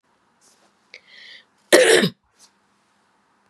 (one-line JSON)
{"cough_length": "3.5 s", "cough_amplitude": 32768, "cough_signal_mean_std_ratio": 0.27, "survey_phase": "beta (2021-08-13 to 2022-03-07)", "age": "45-64", "gender": "Female", "wearing_mask": "No", "symptom_cough_any": true, "symptom_runny_or_blocked_nose": true, "symptom_sore_throat": true, "smoker_status": "Never smoked", "respiratory_condition_asthma": false, "respiratory_condition_other": false, "recruitment_source": "Test and Trace", "submission_delay": "2 days", "covid_test_result": "Positive", "covid_test_method": "RT-qPCR", "covid_ct_value": 23.6, "covid_ct_gene": "ORF1ab gene", "covid_ct_mean": 24.3, "covid_viral_load": "11000 copies/ml", "covid_viral_load_category": "Low viral load (10K-1M copies/ml)"}